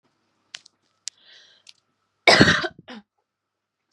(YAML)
cough_length: 3.9 s
cough_amplitude: 32757
cough_signal_mean_std_ratio: 0.24
survey_phase: beta (2021-08-13 to 2022-03-07)
age: 18-44
gender: Female
wearing_mask: 'No'
symptom_none: true
symptom_onset: 13 days
smoker_status: Never smoked
respiratory_condition_asthma: false
respiratory_condition_other: false
recruitment_source: REACT
submission_delay: 2 days
covid_test_result: Negative
covid_test_method: RT-qPCR
influenza_a_test_result: Negative
influenza_b_test_result: Negative